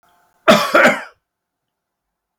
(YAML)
cough_length: 2.4 s
cough_amplitude: 32768
cough_signal_mean_std_ratio: 0.35
survey_phase: beta (2021-08-13 to 2022-03-07)
age: 65+
gender: Male
wearing_mask: 'No'
symptom_none: true
smoker_status: Ex-smoker
respiratory_condition_asthma: false
respiratory_condition_other: false
recruitment_source: REACT
submission_delay: 3 days
covid_test_result: Negative
covid_test_method: RT-qPCR